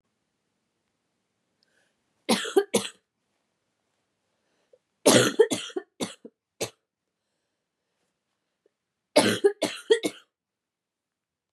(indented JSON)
{
  "three_cough_length": "11.5 s",
  "three_cough_amplitude": 24556,
  "three_cough_signal_mean_std_ratio": 0.26,
  "survey_phase": "beta (2021-08-13 to 2022-03-07)",
  "age": "18-44",
  "gender": "Female",
  "wearing_mask": "No",
  "symptom_cough_any": true,
  "symptom_runny_or_blocked_nose": true,
  "symptom_fatigue": true,
  "symptom_other": true,
  "symptom_onset": "3 days",
  "smoker_status": "Ex-smoker",
  "respiratory_condition_asthma": true,
  "respiratory_condition_other": false,
  "recruitment_source": "Test and Trace",
  "submission_delay": "1 day",
  "covid_test_result": "Positive",
  "covid_test_method": "RT-qPCR",
  "covid_ct_value": 20.6,
  "covid_ct_gene": "N gene"
}